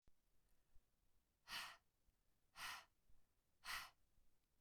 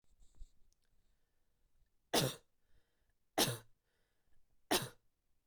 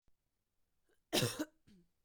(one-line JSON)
{"exhalation_length": "4.6 s", "exhalation_amplitude": 420, "exhalation_signal_mean_std_ratio": 0.42, "three_cough_length": "5.5 s", "three_cough_amplitude": 3682, "three_cough_signal_mean_std_ratio": 0.27, "cough_length": "2.0 s", "cough_amplitude": 3489, "cough_signal_mean_std_ratio": 0.29, "survey_phase": "beta (2021-08-13 to 2022-03-07)", "age": "18-44", "gender": "Female", "wearing_mask": "No", "symptom_runny_or_blocked_nose": true, "symptom_headache": true, "smoker_status": "Never smoked", "respiratory_condition_asthma": false, "respiratory_condition_other": false, "recruitment_source": "Test and Trace", "submission_delay": "1 day", "covid_test_result": "Positive", "covid_test_method": "RT-qPCR", "covid_ct_value": 27.0, "covid_ct_gene": "N gene"}